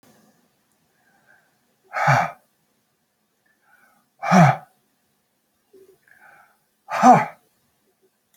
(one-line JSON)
{"exhalation_length": "8.4 s", "exhalation_amplitude": 28834, "exhalation_signal_mean_std_ratio": 0.26, "survey_phase": "beta (2021-08-13 to 2022-03-07)", "age": "65+", "gender": "Male", "wearing_mask": "No", "symptom_cough_any": true, "smoker_status": "Never smoked", "respiratory_condition_asthma": true, "respiratory_condition_other": false, "recruitment_source": "Test and Trace", "submission_delay": "2 days", "covid_test_result": "Positive", "covid_test_method": "ePCR"}